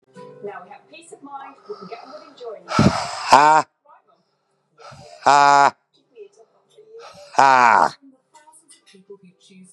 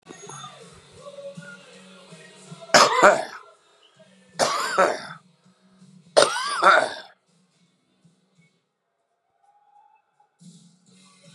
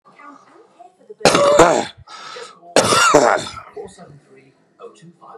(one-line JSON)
{"exhalation_length": "9.7 s", "exhalation_amplitude": 32768, "exhalation_signal_mean_std_ratio": 0.33, "three_cough_length": "11.3 s", "three_cough_amplitude": 32767, "three_cough_signal_mean_std_ratio": 0.3, "cough_length": "5.4 s", "cough_amplitude": 32768, "cough_signal_mean_std_ratio": 0.43, "survey_phase": "beta (2021-08-13 to 2022-03-07)", "age": "65+", "gender": "Male", "wearing_mask": "No", "symptom_cough_any": true, "symptom_runny_or_blocked_nose": true, "symptom_sore_throat": true, "symptom_abdominal_pain": true, "symptom_headache": true, "smoker_status": "Ex-smoker", "respiratory_condition_asthma": false, "respiratory_condition_other": false, "recruitment_source": "Test and Trace", "submission_delay": "2 days", "covid_test_result": "Positive", "covid_test_method": "RT-qPCR", "covid_ct_value": 17.4, "covid_ct_gene": "ORF1ab gene", "covid_ct_mean": 17.7, "covid_viral_load": "1500000 copies/ml", "covid_viral_load_category": "High viral load (>1M copies/ml)"}